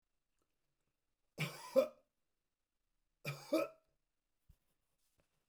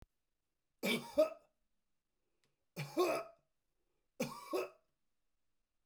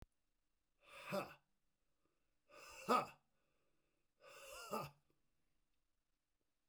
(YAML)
cough_length: 5.5 s
cough_amplitude: 3805
cough_signal_mean_std_ratio: 0.23
three_cough_length: 5.9 s
three_cough_amplitude: 3504
three_cough_signal_mean_std_ratio: 0.33
exhalation_length: 6.7 s
exhalation_amplitude: 1885
exhalation_signal_mean_std_ratio: 0.27
survey_phase: beta (2021-08-13 to 2022-03-07)
age: 65+
gender: Male
wearing_mask: 'No'
symptom_none: true
symptom_onset: 8 days
smoker_status: Never smoked
respiratory_condition_asthma: false
respiratory_condition_other: false
recruitment_source: REACT
submission_delay: 2 days
covid_test_result: Negative
covid_test_method: RT-qPCR